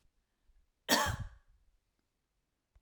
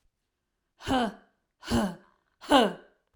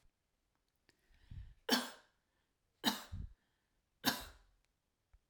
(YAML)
cough_length: 2.8 s
cough_amplitude: 8091
cough_signal_mean_std_ratio: 0.27
exhalation_length: 3.2 s
exhalation_amplitude: 14149
exhalation_signal_mean_std_ratio: 0.37
three_cough_length: 5.3 s
three_cough_amplitude: 4234
three_cough_signal_mean_std_ratio: 0.28
survey_phase: alpha (2021-03-01 to 2021-08-12)
age: 45-64
gender: Female
wearing_mask: 'No'
symptom_none: true
smoker_status: Never smoked
respiratory_condition_asthma: false
respiratory_condition_other: false
recruitment_source: REACT
submission_delay: 2 days
covid_test_result: Negative
covid_test_method: RT-qPCR